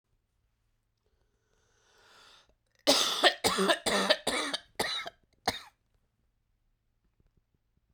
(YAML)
cough_length: 7.9 s
cough_amplitude: 12932
cough_signal_mean_std_ratio: 0.34
survey_phase: beta (2021-08-13 to 2022-03-07)
age: 18-44
gender: Female
wearing_mask: 'No'
symptom_cough_any: true
symptom_new_continuous_cough: true
symptom_runny_or_blocked_nose: true
symptom_shortness_of_breath: true
symptom_sore_throat: true
symptom_fatigue: true
symptom_fever_high_temperature: true
symptom_headache: true
smoker_status: Ex-smoker
respiratory_condition_asthma: false
respiratory_condition_other: false
recruitment_source: Test and Trace
submission_delay: 2 days
covid_test_result: Positive
covid_test_method: RT-qPCR
covid_ct_value: 22.4
covid_ct_gene: ORF1ab gene
covid_ct_mean: 23.5
covid_viral_load: 20000 copies/ml
covid_viral_load_category: Low viral load (10K-1M copies/ml)